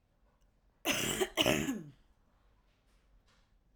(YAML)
three_cough_length: 3.8 s
three_cough_amplitude: 7036
three_cough_signal_mean_std_ratio: 0.38
survey_phase: alpha (2021-03-01 to 2021-08-12)
age: 45-64
gender: Female
wearing_mask: 'No'
symptom_none: true
smoker_status: Ex-smoker
respiratory_condition_asthma: false
respiratory_condition_other: false
recruitment_source: REACT
submission_delay: 5 days
covid_test_method: RT-qPCR